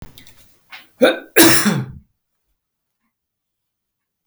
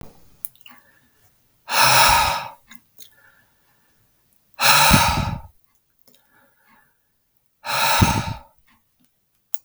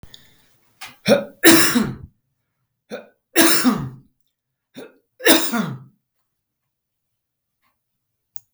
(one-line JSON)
{"cough_length": "4.3 s", "cough_amplitude": 32768, "cough_signal_mean_std_ratio": 0.31, "exhalation_length": "9.6 s", "exhalation_amplitude": 32768, "exhalation_signal_mean_std_ratio": 0.38, "three_cough_length": "8.5 s", "three_cough_amplitude": 32768, "three_cough_signal_mean_std_ratio": 0.34, "survey_phase": "beta (2021-08-13 to 2022-03-07)", "age": "45-64", "gender": "Male", "wearing_mask": "No", "symptom_none": true, "smoker_status": "Ex-smoker", "respiratory_condition_asthma": false, "respiratory_condition_other": false, "recruitment_source": "REACT", "submission_delay": "3 days", "covid_test_result": "Negative", "covid_test_method": "RT-qPCR", "influenza_a_test_result": "Negative", "influenza_b_test_result": "Negative"}